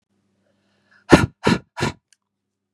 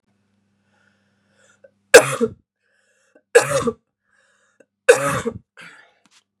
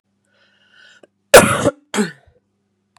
{"exhalation_length": "2.7 s", "exhalation_amplitude": 32768, "exhalation_signal_mean_std_ratio": 0.25, "three_cough_length": "6.4 s", "three_cough_amplitude": 32768, "three_cough_signal_mean_std_ratio": 0.24, "cough_length": "3.0 s", "cough_amplitude": 32768, "cough_signal_mean_std_ratio": 0.27, "survey_phase": "beta (2021-08-13 to 2022-03-07)", "age": "45-64", "gender": "Female", "wearing_mask": "No", "symptom_cough_any": true, "symptom_runny_or_blocked_nose": true, "symptom_onset": "4 days", "smoker_status": "Ex-smoker", "respiratory_condition_asthma": false, "respiratory_condition_other": false, "recruitment_source": "Test and Trace", "submission_delay": "2 days", "covid_test_result": "Positive", "covid_test_method": "RT-qPCR", "covid_ct_value": 17.7, "covid_ct_gene": "ORF1ab gene", "covid_ct_mean": 18.0, "covid_viral_load": "1300000 copies/ml", "covid_viral_load_category": "High viral load (>1M copies/ml)"}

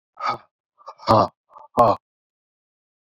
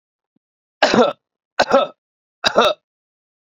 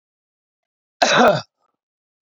{"exhalation_length": "3.1 s", "exhalation_amplitude": 26432, "exhalation_signal_mean_std_ratio": 0.31, "three_cough_length": "3.4 s", "three_cough_amplitude": 30664, "three_cough_signal_mean_std_ratio": 0.37, "cough_length": "2.3 s", "cough_amplitude": 27763, "cough_signal_mean_std_ratio": 0.33, "survey_phase": "beta (2021-08-13 to 2022-03-07)", "age": "45-64", "gender": "Male", "wearing_mask": "No", "symptom_diarrhoea": true, "symptom_onset": "5 days", "smoker_status": "Ex-smoker", "respiratory_condition_asthma": false, "respiratory_condition_other": false, "recruitment_source": "REACT", "submission_delay": "0 days", "covid_test_result": "Negative", "covid_test_method": "RT-qPCR"}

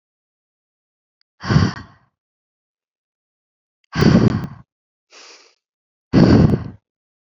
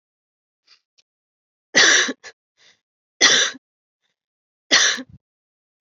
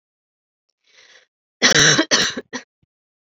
{"exhalation_length": "7.3 s", "exhalation_amplitude": 29338, "exhalation_signal_mean_std_ratio": 0.32, "three_cough_length": "5.8 s", "three_cough_amplitude": 29700, "three_cough_signal_mean_std_ratio": 0.32, "cough_length": "3.2 s", "cough_amplitude": 31248, "cough_signal_mean_std_ratio": 0.36, "survey_phase": "beta (2021-08-13 to 2022-03-07)", "age": "18-44", "gender": "Female", "wearing_mask": "No", "symptom_cough_any": true, "symptom_runny_or_blocked_nose": true, "symptom_sore_throat": true, "symptom_fatigue": true, "symptom_headache": true, "smoker_status": "Never smoked", "respiratory_condition_asthma": false, "respiratory_condition_other": false, "recruitment_source": "Test and Trace", "submission_delay": "2 days", "covid_test_result": "Positive", "covid_test_method": "RT-qPCR", "covid_ct_value": 12.9, "covid_ct_gene": "ORF1ab gene", "covid_ct_mean": 13.5, "covid_viral_load": "38000000 copies/ml", "covid_viral_load_category": "High viral load (>1M copies/ml)"}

